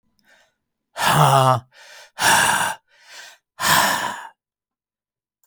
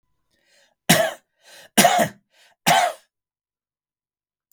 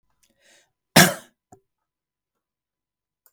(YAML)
exhalation_length: 5.5 s
exhalation_amplitude: 28525
exhalation_signal_mean_std_ratio: 0.47
three_cough_length: 4.5 s
three_cough_amplitude: 32768
three_cough_signal_mean_std_ratio: 0.33
cough_length: 3.3 s
cough_amplitude: 32766
cough_signal_mean_std_ratio: 0.16
survey_phase: beta (2021-08-13 to 2022-03-07)
age: 45-64
gender: Male
wearing_mask: 'No'
symptom_none: true
smoker_status: Ex-smoker
respiratory_condition_asthma: false
respiratory_condition_other: false
recruitment_source: REACT
submission_delay: 12 days
covid_test_result: Negative
covid_test_method: RT-qPCR
influenza_a_test_result: Negative
influenza_b_test_result: Negative